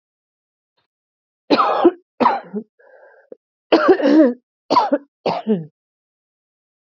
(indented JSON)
{
  "cough_length": "6.9 s",
  "cough_amplitude": 29597,
  "cough_signal_mean_std_ratio": 0.4,
  "survey_phase": "alpha (2021-03-01 to 2021-08-12)",
  "age": "18-44",
  "gender": "Female",
  "wearing_mask": "No",
  "symptom_cough_any": true,
  "symptom_new_continuous_cough": true,
  "symptom_diarrhoea": true,
  "symptom_fatigue": true,
  "symptom_fever_high_temperature": true,
  "symptom_headache": true,
  "symptom_change_to_sense_of_smell_or_taste": true,
  "symptom_loss_of_taste": true,
  "symptom_onset": "4 days",
  "smoker_status": "Ex-smoker",
  "respiratory_condition_asthma": false,
  "respiratory_condition_other": false,
  "recruitment_source": "Test and Trace",
  "submission_delay": "2 days",
  "covid_test_result": "Positive",
  "covid_test_method": "RT-qPCR",
  "covid_ct_value": 20.1,
  "covid_ct_gene": "ORF1ab gene"
}